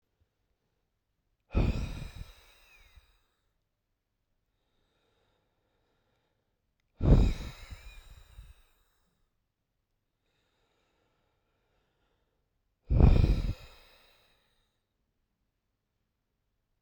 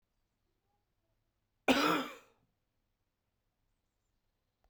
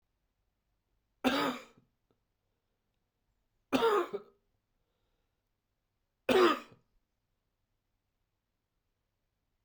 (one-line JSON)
{"exhalation_length": "16.8 s", "exhalation_amplitude": 14389, "exhalation_signal_mean_std_ratio": 0.22, "cough_length": "4.7 s", "cough_amplitude": 6528, "cough_signal_mean_std_ratio": 0.22, "three_cough_length": "9.6 s", "three_cough_amplitude": 7283, "three_cough_signal_mean_std_ratio": 0.25, "survey_phase": "beta (2021-08-13 to 2022-03-07)", "age": "18-44", "gender": "Male", "wearing_mask": "No", "symptom_cough_any": true, "symptom_new_continuous_cough": true, "symptom_runny_or_blocked_nose": true, "symptom_shortness_of_breath": true, "symptom_fatigue": true, "symptom_headache": true, "symptom_onset": "3 days", "smoker_status": "Never smoked", "respiratory_condition_asthma": true, "respiratory_condition_other": false, "recruitment_source": "Test and Trace", "submission_delay": "1 day", "covid_test_result": "Positive", "covid_test_method": "RT-qPCR", "covid_ct_value": 14.7, "covid_ct_gene": "N gene", "covid_ct_mean": 14.8, "covid_viral_load": "14000000 copies/ml", "covid_viral_load_category": "High viral load (>1M copies/ml)"}